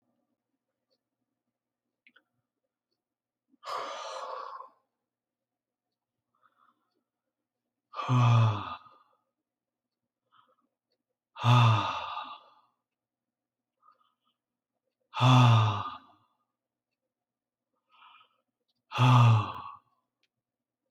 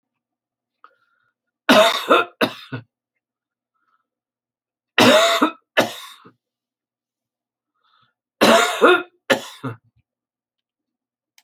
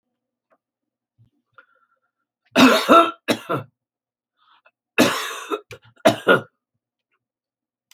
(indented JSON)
{
  "exhalation_length": "20.9 s",
  "exhalation_amplitude": 9636,
  "exhalation_signal_mean_std_ratio": 0.3,
  "three_cough_length": "11.4 s",
  "three_cough_amplitude": 29956,
  "three_cough_signal_mean_std_ratio": 0.32,
  "cough_length": "7.9 s",
  "cough_amplitude": 29053,
  "cough_signal_mean_std_ratio": 0.3,
  "survey_phase": "beta (2021-08-13 to 2022-03-07)",
  "age": "65+",
  "gender": "Male",
  "wearing_mask": "No",
  "symptom_none": true,
  "smoker_status": "Ex-smoker",
  "respiratory_condition_asthma": false,
  "respiratory_condition_other": false,
  "recruitment_source": "REACT",
  "submission_delay": "1 day",
  "covid_test_result": "Negative",
  "covid_test_method": "RT-qPCR"
}